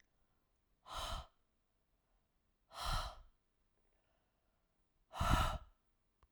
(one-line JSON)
{"exhalation_length": "6.3 s", "exhalation_amplitude": 4224, "exhalation_signal_mean_std_ratio": 0.32, "survey_phase": "alpha (2021-03-01 to 2021-08-12)", "age": "18-44", "gender": "Female", "wearing_mask": "No", "symptom_none": true, "smoker_status": "Never smoked", "respiratory_condition_asthma": false, "respiratory_condition_other": false, "recruitment_source": "REACT", "submission_delay": "1 day", "covid_test_result": "Negative", "covid_test_method": "RT-qPCR"}